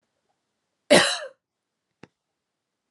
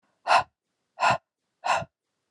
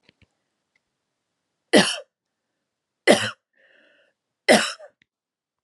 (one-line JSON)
{"cough_length": "2.9 s", "cough_amplitude": 26401, "cough_signal_mean_std_ratio": 0.22, "exhalation_length": "2.3 s", "exhalation_amplitude": 13047, "exhalation_signal_mean_std_ratio": 0.36, "three_cough_length": "5.6 s", "three_cough_amplitude": 29051, "three_cough_signal_mean_std_ratio": 0.24, "survey_phase": "alpha (2021-03-01 to 2021-08-12)", "age": "18-44", "gender": "Female", "wearing_mask": "No", "symptom_none": true, "symptom_fatigue": true, "symptom_onset": "9 days", "smoker_status": "Ex-smoker", "respiratory_condition_asthma": false, "respiratory_condition_other": false, "recruitment_source": "REACT", "submission_delay": "2 days", "covid_test_result": "Negative", "covid_test_method": "RT-qPCR"}